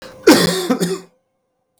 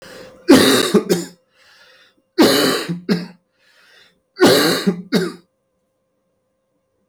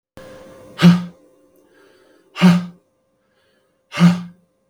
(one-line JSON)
{"cough_length": "1.8 s", "cough_amplitude": 32768, "cough_signal_mean_std_ratio": 0.46, "three_cough_length": "7.1 s", "three_cough_amplitude": 32768, "three_cough_signal_mean_std_ratio": 0.44, "exhalation_length": "4.7 s", "exhalation_amplitude": 32768, "exhalation_signal_mean_std_ratio": 0.32, "survey_phase": "beta (2021-08-13 to 2022-03-07)", "age": "45-64", "gender": "Male", "wearing_mask": "No", "symptom_none": true, "smoker_status": "Ex-smoker", "respiratory_condition_asthma": false, "respiratory_condition_other": false, "recruitment_source": "Test and Trace", "submission_delay": "1 day", "covid_test_result": "Positive", "covid_test_method": "RT-qPCR"}